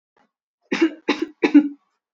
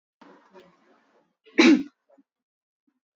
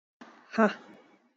{"three_cough_length": "2.1 s", "three_cough_amplitude": 24265, "three_cough_signal_mean_std_ratio": 0.35, "cough_length": "3.2 s", "cough_amplitude": 17584, "cough_signal_mean_std_ratio": 0.23, "exhalation_length": "1.4 s", "exhalation_amplitude": 9344, "exhalation_signal_mean_std_ratio": 0.3, "survey_phase": "beta (2021-08-13 to 2022-03-07)", "age": "18-44", "gender": "Female", "wearing_mask": "Yes", "symptom_shortness_of_breath": true, "symptom_sore_throat": true, "smoker_status": "Never smoked", "respiratory_condition_asthma": false, "respiratory_condition_other": false, "recruitment_source": "REACT", "submission_delay": "7 days", "covid_test_result": "Negative", "covid_test_method": "RT-qPCR", "influenza_a_test_result": "Negative", "influenza_b_test_result": "Negative"}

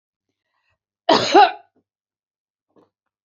{"cough_length": "3.2 s", "cough_amplitude": 29627, "cough_signal_mean_std_ratio": 0.25, "survey_phase": "beta (2021-08-13 to 2022-03-07)", "age": "65+", "gender": "Female", "wearing_mask": "No", "symptom_none": true, "smoker_status": "Never smoked", "respiratory_condition_asthma": false, "respiratory_condition_other": false, "recruitment_source": "REACT", "submission_delay": "1 day", "covid_test_result": "Negative", "covid_test_method": "RT-qPCR", "influenza_a_test_result": "Unknown/Void", "influenza_b_test_result": "Unknown/Void"}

